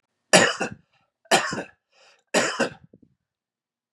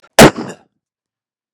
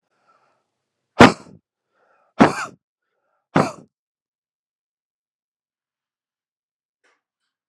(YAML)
three_cough_length: 3.9 s
three_cough_amplitude: 29699
three_cough_signal_mean_std_ratio: 0.34
cough_length: 1.5 s
cough_amplitude: 32768
cough_signal_mean_std_ratio: 0.27
exhalation_length: 7.7 s
exhalation_amplitude: 32768
exhalation_signal_mean_std_ratio: 0.16
survey_phase: beta (2021-08-13 to 2022-03-07)
age: 45-64
gender: Male
wearing_mask: 'No'
symptom_new_continuous_cough: true
symptom_runny_or_blocked_nose: true
symptom_onset: 7 days
smoker_status: Ex-smoker
respiratory_condition_asthma: false
respiratory_condition_other: false
recruitment_source: REACT
submission_delay: 2 days
covid_test_result: Positive
covid_test_method: RT-qPCR
covid_ct_value: 17.0
covid_ct_gene: E gene
influenza_a_test_result: Negative
influenza_b_test_result: Negative